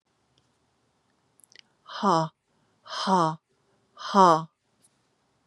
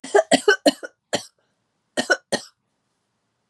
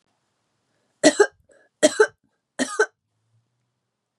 {"exhalation_length": "5.5 s", "exhalation_amplitude": 23837, "exhalation_signal_mean_std_ratio": 0.29, "cough_length": "3.5 s", "cough_amplitude": 31284, "cough_signal_mean_std_ratio": 0.31, "three_cough_length": "4.2 s", "three_cough_amplitude": 32254, "three_cough_signal_mean_std_ratio": 0.25, "survey_phase": "beta (2021-08-13 to 2022-03-07)", "age": "45-64", "gender": "Female", "wearing_mask": "No", "symptom_cough_any": true, "symptom_runny_or_blocked_nose": true, "symptom_shortness_of_breath": true, "symptom_fatigue": true, "symptom_onset": "2 days", "smoker_status": "Never smoked", "respiratory_condition_asthma": false, "respiratory_condition_other": false, "recruitment_source": "Test and Trace", "submission_delay": "1 day", "covid_test_result": "Positive", "covid_test_method": "RT-qPCR", "covid_ct_value": 21.9, "covid_ct_gene": "N gene"}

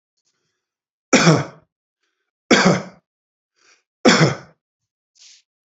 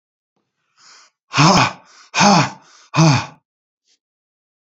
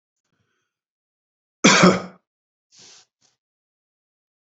{"three_cough_length": "5.7 s", "three_cough_amplitude": 32767, "three_cough_signal_mean_std_ratio": 0.31, "exhalation_length": "4.6 s", "exhalation_amplitude": 30813, "exhalation_signal_mean_std_ratio": 0.38, "cough_length": "4.5 s", "cough_amplitude": 29161, "cough_signal_mean_std_ratio": 0.22, "survey_phase": "beta (2021-08-13 to 2022-03-07)", "age": "65+", "gender": "Male", "wearing_mask": "No", "symptom_none": true, "smoker_status": "Ex-smoker", "respiratory_condition_asthma": false, "respiratory_condition_other": false, "recruitment_source": "REACT", "submission_delay": "2 days", "covid_test_result": "Negative", "covid_test_method": "RT-qPCR"}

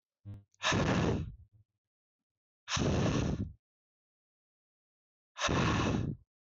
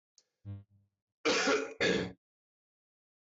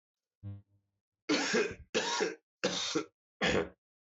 {"exhalation_length": "6.5 s", "exhalation_amplitude": 5289, "exhalation_signal_mean_std_ratio": 0.51, "cough_length": "3.2 s", "cough_amplitude": 4553, "cough_signal_mean_std_ratio": 0.43, "three_cough_length": "4.2 s", "three_cough_amplitude": 4670, "three_cough_signal_mean_std_ratio": 0.52, "survey_phase": "beta (2021-08-13 to 2022-03-07)", "age": "18-44", "gender": "Male", "wearing_mask": "No", "symptom_cough_any": true, "symptom_runny_or_blocked_nose": true, "symptom_shortness_of_breath": true, "symptom_sore_throat": true, "symptom_fatigue": true, "symptom_headache": true, "symptom_onset": "3 days", "smoker_status": "Never smoked", "respiratory_condition_asthma": false, "respiratory_condition_other": false, "recruitment_source": "Test and Trace", "submission_delay": "1 day", "covid_test_result": "Negative", "covid_test_method": "RT-qPCR"}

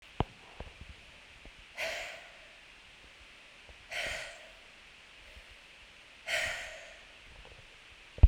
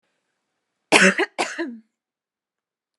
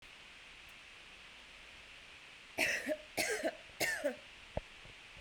{"exhalation_length": "8.3 s", "exhalation_amplitude": 15671, "exhalation_signal_mean_std_ratio": 0.26, "cough_length": "3.0 s", "cough_amplitude": 32768, "cough_signal_mean_std_ratio": 0.3, "three_cough_length": "5.2 s", "three_cough_amplitude": 3559, "three_cough_signal_mean_std_ratio": 0.53, "survey_phase": "beta (2021-08-13 to 2022-03-07)", "age": "18-44", "gender": "Female", "wearing_mask": "No", "symptom_none": true, "smoker_status": "Ex-smoker", "respiratory_condition_asthma": false, "respiratory_condition_other": false, "recruitment_source": "REACT", "submission_delay": "9 days", "covid_test_result": "Negative", "covid_test_method": "RT-qPCR"}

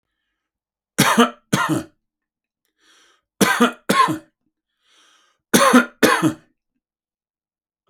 {"three_cough_length": "7.9 s", "three_cough_amplitude": 32767, "three_cough_signal_mean_std_ratio": 0.36, "survey_phase": "beta (2021-08-13 to 2022-03-07)", "age": "65+", "gender": "Male", "wearing_mask": "No", "symptom_none": true, "smoker_status": "Never smoked", "respiratory_condition_asthma": false, "respiratory_condition_other": false, "recruitment_source": "REACT", "submission_delay": "1 day", "covid_test_result": "Negative", "covid_test_method": "RT-qPCR", "influenza_a_test_result": "Unknown/Void", "influenza_b_test_result": "Unknown/Void"}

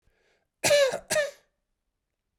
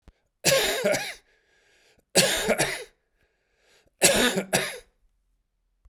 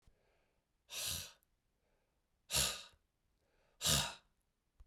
{"cough_length": "2.4 s", "cough_amplitude": 9925, "cough_signal_mean_std_ratio": 0.39, "three_cough_length": "5.9 s", "three_cough_amplitude": 23561, "three_cough_signal_mean_std_ratio": 0.44, "exhalation_length": "4.9 s", "exhalation_amplitude": 3572, "exhalation_signal_mean_std_ratio": 0.33, "survey_phase": "beta (2021-08-13 to 2022-03-07)", "age": "45-64", "gender": "Male", "wearing_mask": "No", "symptom_cough_any": true, "symptom_runny_or_blocked_nose": true, "symptom_shortness_of_breath": true, "symptom_sore_throat": true, "symptom_diarrhoea": true, "symptom_fatigue": true, "symptom_onset": "5 days", "smoker_status": "Never smoked", "respiratory_condition_asthma": false, "respiratory_condition_other": false, "recruitment_source": "Test and Trace", "submission_delay": "2 days", "covid_test_result": "Positive", "covid_test_method": "ePCR"}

